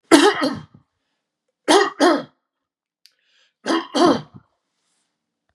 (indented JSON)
{
  "three_cough_length": "5.5 s",
  "three_cough_amplitude": 32768,
  "three_cough_signal_mean_std_ratio": 0.36,
  "survey_phase": "beta (2021-08-13 to 2022-03-07)",
  "age": "45-64",
  "gender": "Male",
  "wearing_mask": "No",
  "symptom_none": true,
  "smoker_status": "Never smoked",
  "respiratory_condition_asthma": false,
  "respiratory_condition_other": false,
  "recruitment_source": "REACT",
  "submission_delay": "3 days",
  "covid_test_result": "Negative",
  "covid_test_method": "RT-qPCR",
  "influenza_a_test_result": "Negative",
  "influenza_b_test_result": "Negative"
}